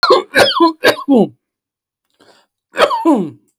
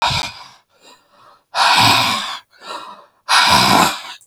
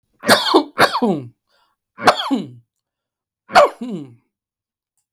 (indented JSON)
{
  "cough_length": "3.6 s",
  "cough_amplitude": 32768,
  "cough_signal_mean_std_ratio": 0.51,
  "exhalation_length": "4.3 s",
  "exhalation_amplitude": 32768,
  "exhalation_signal_mean_std_ratio": 0.57,
  "three_cough_length": "5.1 s",
  "three_cough_amplitude": 32768,
  "three_cough_signal_mean_std_ratio": 0.38,
  "survey_phase": "beta (2021-08-13 to 2022-03-07)",
  "age": "65+",
  "gender": "Male",
  "wearing_mask": "No",
  "symptom_none": true,
  "smoker_status": "Ex-smoker",
  "respiratory_condition_asthma": false,
  "respiratory_condition_other": false,
  "recruitment_source": "REACT",
  "submission_delay": "5 days",
  "covid_test_result": "Negative",
  "covid_test_method": "RT-qPCR",
  "influenza_a_test_result": "Negative",
  "influenza_b_test_result": "Negative"
}